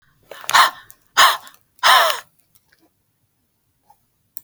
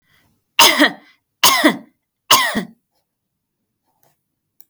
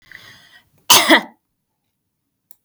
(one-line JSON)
{"exhalation_length": "4.4 s", "exhalation_amplitude": 32768, "exhalation_signal_mean_std_ratio": 0.32, "three_cough_length": "4.7 s", "three_cough_amplitude": 32768, "three_cough_signal_mean_std_ratio": 0.34, "cough_length": "2.6 s", "cough_amplitude": 32768, "cough_signal_mean_std_ratio": 0.27, "survey_phase": "beta (2021-08-13 to 2022-03-07)", "age": "45-64", "gender": "Female", "wearing_mask": "No", "symptom_none": true, "smoker_status": "Never smoked", "respiratory_condition_asthma": false, "respiratory_condition_other": false, "recruitment_source": "REACT", "submission_delay": "5 days", "covid_test_result": "Negative", "covid_test_method": "RT-qPCR", "influenza_a_test_result": "Negative", "influenza_b_test_result": "Negative"}